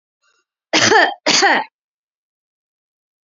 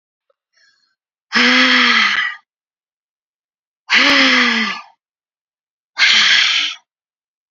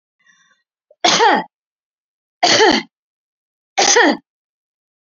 cough_length: 3.2 s
cough_amplitude: 31027
cough_signal_mean_std_ratio: 0.39
exhalation_length: 7.5 s
exhalation_amplitude: 32104
exhalation_signal_mean_std_ratio: 0.51
three_cough_length: 5.0 s
three_cough_amplitude: 29825
three_cough_signal_mean_std_ratio: 0.39
survey_phase: beta (2021-08-13 to 2022-03-07)
age: 18-44
gender: Female
wearing_mask: 'No'
symptom_none: true
smoker_status: Prefer not to say
respiratory_condition_asthma: false
respiratory_condition_other: false
recruitment_source: REACT
submission_delay: 1 day
covid_test_result: Negative
covid_test_method: RT-qPCR
influenza_a_test_result: Negative
influenza_b_test_result: Negative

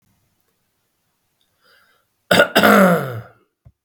cough_length: 3.8 s
cough_amplitude: 32768
cough_signal_mean_std_ratio: 0.35
survey_phase: beta (2021-08-13 to 2022-03-07)
age: 45-64
gender: Male
wearing_mask: 'No'
symptom_none: true
smoker_status: Ex-smoker
respiratory_condition_asthma: true
respiratory_condition_other: false
recruitment_source: REACT
submission_delay: 13 days
covid_test_result: Negative
covid_test_method: RT-qPCR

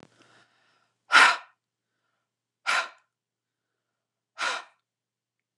exhalation_length: 5.6 s
exhalation_amplitude: 24854
exhalation_signal_mean_std_ratio: 0.23
survey_phase: beta (2021-08-13 to 2022-03-07)
age: 45-64
gender: Female
wearing_mask: 'No'
symptom_none: true
smoker_status: Never smoked
respiratory_condition_asthma: false
respiratory_condition_other: false
recruitment_source: REACT
submission_delay: 1 day
covid_test_result: Negative
covid_test_method: RT-qPCR
influenza_a_test_result: Negative
influenza_b_test_result: Negative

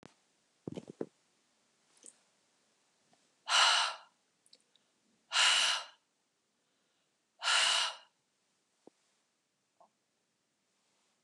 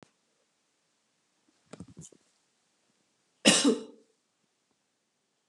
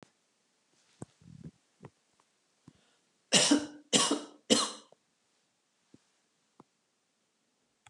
exhalation_length: 11.2 s
exhalation_amplitude: 7453
exhalation_signal_mean_std_ratio: 0.3
cough_length: 5.5 s
cough_amplitude: 18514
cough_signal_mean_std_ratio: 0.2
three_cough_length: 7.9 s
three_cough_amplitude: 11725
three_cough_signal_mean_std_ratio: 0.25
survey_phase: beta (2021-08-13 to 2022-03-07)
age: 65+
gender: Female
wearing_mask: 'No'
symptom_fatigue: true
symptom_headache: true
smoker_status: Never smoked
respiratory_condition_asthma: false
respiratory_condition_other: false
recruitment_source: Test and Trace
submission_delay: 1 day
covid_test_result: Positive
covid_test_method: RT-qPCR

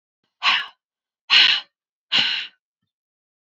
exhalation_length: 3.4 s
exhalation_amplitude: 28935
exhalation_signal_mean_std_ratio: 0.37
survey_phase: beta (2021-08-13 to 2022-03-07)
age: 45-64
gender: Female
wearing_mask: 'No'
symptom_none: true
smoker_status: Never smoked
respiratory_condition_asthma: false
respiratory_condition_other: false
recruitment_source: REACT
submission_delay: 1 day
covid_test_result: Negative
covid_test_method: RT-qPCR
influenza_a_test_result: Negative
influenza_b_test_result: Negative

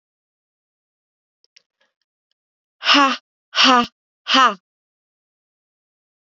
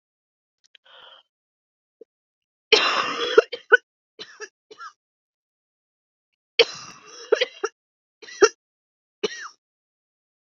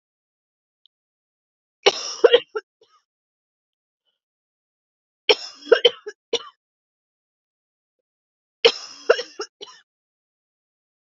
exhalation_length: 6.3 s
exhalation_amplitude: 32478
exhalation_signal_mean_std_ratio: 0.28
cough_length: 10.4 s
cough_amplitude: 30501
cough_signal_mean_std_ratio: 0.23
three_cough_length: 11.2 s
three_cough_amplitude: 29308
three_cough_signal_mean_std_ratio: 0.19
survey_phase: beta (2021-08-13 to 2022-03-07)
age: 45-64
gender: Female
wearing_mask: 'No'
symptom_cough_any: true
symptom_runny_or_blocked_nose: true
symptom_sore_throat: true
symptom_fatigue: true
symptom_headache: true
symptom_onset: 3 days
smoker_status: Ex-smoker
respiratory_condition_asthma: false
respiratory_condition_other: false
recruitment_source: Test and Trace
submission_delay: 1 day
covid_test_result: Positive
covid_test_method: RT-qPCR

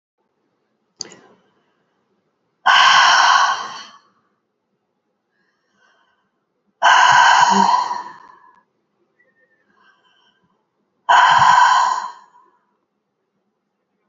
exhalation_length: 14.1 s
exhalation_amplitude: 32768
exhalation_signal_mean_std_ratio: 0.4
survey_phase: beta (2021-08-13 to 2022-03-07)
age: 45-64
gender: Female
wearing_mask: 'No'
symptom_none: true
smoker_status: Ex-smoker
respiratory_condition_asthma: true
respiratory_condition_other: false
recruitment_source: REACT
submission_delay: 2 days
covid_test_result: Negative
covid_test_method: RT-qPCR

